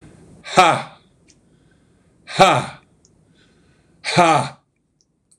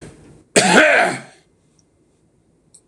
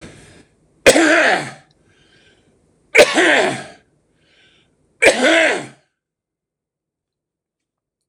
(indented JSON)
{
  "exhalation_length": "5.4 s",
  "exhalation_amplitude": 26028,
  "exhalation_signal_mean_std_ratio": 0.33,
  "cough_length": "2.9 s",
  "cough_amplitude": 26028,
  "cough_signal_mean_std_ratio": 0.38,
  "three_cough_length": "8.1 s",
  "three_cough_amplitude": 26028,
  "three_cough_signal_mean_std_ratio": 0.37,
  "survey_phase": "beta (2021-08-13 to 2022-03-07)",
  "age": "65+",
  "gender": "Male",
  "wearing_mask": "No",
  "symptom_none": true,
  "smoker_status": "Ex-smoker",
  "respiratory_condition_asthma": false,
  "respiratory_condition_other": false,
  "recruitment_source": "REACT",
  "submission_delay": "3 days",
  "covid_test_result": "Negative",
  "covid_test_method": "RT-qPCR",
  "influenza_a_test_result": "Negative",
  "influenza_b_test_result": "Negative"
}